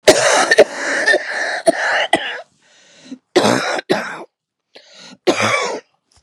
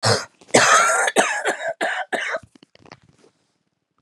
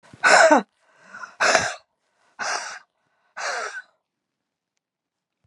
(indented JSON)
{
  "cough_length": "6.2 s",
  "cough_amplitude": 32768,
  "cough_signal_mean_std_ratio": 0.55,
  "three_cough_length": "4.0 s",
  "three_cough_amplitude": 32682,
  "three_cough_signal_mean_std_ratio": 0.52,
  "exhalation_length": "5.5 s",
  "exhalation_amplitude": 30927,
  "exhalation_signal_mean_std_ratio": 0.34,
  "survey_phase": "beta (2021-08-13 to 2022-03-07)",
  "age": "45-64",
  "gender": "Female",
  "wearing_mask": "No",
  "symptom_cough_any": true,
  "symptom_runny_or_blocked_nose": true,
  "symptom_sore_throat": true,
  "symptom_abdominal_pain": true,
  "symptom_fatigue": true,
  "symptom_headache": true,
  "symptom_onset": "3 days",
  "smoker_status": "Never smoked",
  "respiratory_condition_asthma": false,
  "respiratory_condition_other": false,
  "recruitment_source": "Test and Trace",
  "submission_delay": "2 days",
  "covid_test_result": "Positive",
  "covid_test_method": "RT-qPCR"
}